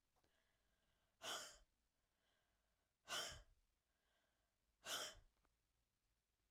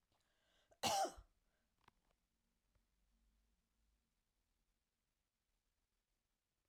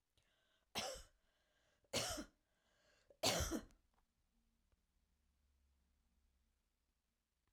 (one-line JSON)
{"exhalation_length": "6.5 s", "exhalation_amplitude": 528, "exhalation_signal_mean_std_ratio": 0.32, "cough_length": "6.7 s", "cough_amplitude": 1577, "cough_signal_mean_std_ratio": 0.19, "three_cough_length": "7.5 s", "three_cough_amplitude": 2164, "three_cough_signal_mean_std_ratio": 0.28, "survey_phase": "alpha (2021-03-01 to 2021-08-12)", "age": "45-64", "gender": "Female", "wearing_mask": "No", "symptom_none": true, "smoker_status": "Never smoked", "respiratory_condition_asthma": false, "respiratory_condition_other": false, "recruitment_source": "REACT", "submission_delay": "1 day", "covid_test_result": "Negative", "covid_test_method": "RT-qPCR"}